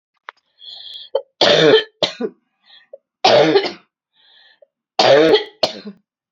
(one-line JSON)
{"three_cough_length": "6.3 s", "three_cough_amplitude": 32767, "three_cough_signal_mean_std_ratio": 0.42, "survey_phase": "beta (2021-08-13 to 2022-03-07)", "age": "18-44", "gender": "Female", "wearing_mask": "No", "symptom_cough_any": true, "symptom_shortness_of_breath": true, "symptom_fatigue": true, "symptom_fever_high_temperature": true, "symptom_headache": true, "symptom_onset": "2 days", "smoker_status": "Never smoked", "respiratory_condition_asthma": false, "respiratory_condition_other": false, "recruitment_source": "Test and Trace", "submission_delay": "2 days", "covid_test_result": "Positive", "covid_test_method": "RT-qPCR"}